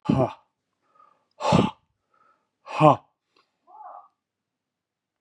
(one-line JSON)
{"exhalation_length": "5.2 s", "exhalation_amplitude": 25455, "exhalation_signal_mean_std_ratio": 0.27, "survey_phase": "beta (2021-08-13 to 2022-03-07)", "age": "45-64", "gender": "Male", "wearing_mask": "No", "symptom_cough_any": true, "symptom_runny_or_blocked_nose": true, "symptom_fatigue": true, "symptom_fever_high_temperature": true, "symptom_headache": true, "symptom_loss_of_taste": true, "symptom_onset": "7 days", "smoker_status": "Never smoked", "respiratory_condition_asthma": false, "respiratory_condition_other": false, "recruitment_source": "Test and Trace", "submission_delay": "5 days", "covid_test_result": "Positive", "covid_test_method": "RT-qPCR", "covid_ct_value": 17.3, "covid_ct_gene": "N gene", "covid_ct_mean": 18.1, "covid_viral_load": "1200000 copies/ml", "covid_viral_load_category": "High viral load (>1M copies/ml)"}